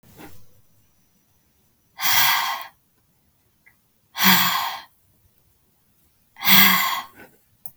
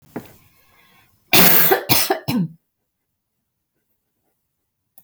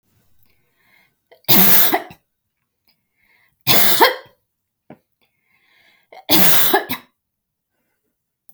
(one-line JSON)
{"exhalation_length": "7.8 s", "exhalation_amplitude": 32199, "exhalation_signal_mean_std_ratio": 0.37, "cough_length": "5.0 s", "cough_amplitude": 32768, "cough_signal_mean_std_ratio": 0.34, "three_cough_length": "8.5 s", "three_cough_amplitude": 32768, "three_cough_signal_mean_std_ratio": 0.35, "survey_phase": "beta (2021-08-13 to 2022-03-07)", "age": "18-44", "gender": "Female", "wearing_mask": "No", "symptom_none": true, "smoker_status": "Never smoked", "respiratory_condition_asthma": false, "respiratory_condition_other": false, "recruitment_source": "REACT", "submission_delay": "1 day", "covid_test_result": "Negative", "covid_test_method": "RT-qPCR", "influenza_a_test_result": "Negative", "influenza_b_test_result": "Negative"}